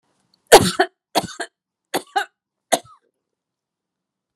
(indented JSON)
{
  "cough_length": "4.4 s",
  "cough_amplitude": 32768,
  "cough_signal_mean_std_ratio": 0.23,
  "survey_phase": "beta (2021-08-13 to 2022-03-07)",
  "age": "65+",
  "gender": "Female",
  "wearing_mask": "No",
  "symptom_none": true,
  "smoker_status": "Never smoked",
  "respiratory_condition_asthma": false,
  "respiratory_condition_other": false,
  "recruitment_source": "REACT",
  "submission_delay": "1 day",
  "covid_test_result": "Negative",
  "covid_test_method": "RT-qPCR"
}